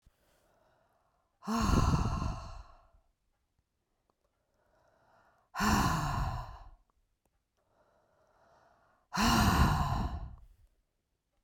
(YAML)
exhalation_length: 11.4 s
exhalation_amplitude: 6895
exhalation_signal_mean_std_ratio: 0.42
survey_phase: beta (2021-08-13 to 2022-03-07)
age: 65+
gender: Female
wearing_mask: 'No'
symptom_cough_any: true
symptom_new_continuous_cough: true
symptom_runny_or_blocked_nose: true
symptom_sore_throat: true
symptom_fatigue: true
symptom_headache: true
smoker_status: Never smoked
respiratory_condition_asthma: false
respiratory_condition_other: false
recruitment_source: Test and Trace
submission_delay: 0 days
covid_test_result: Positive
covid_test_method: LFT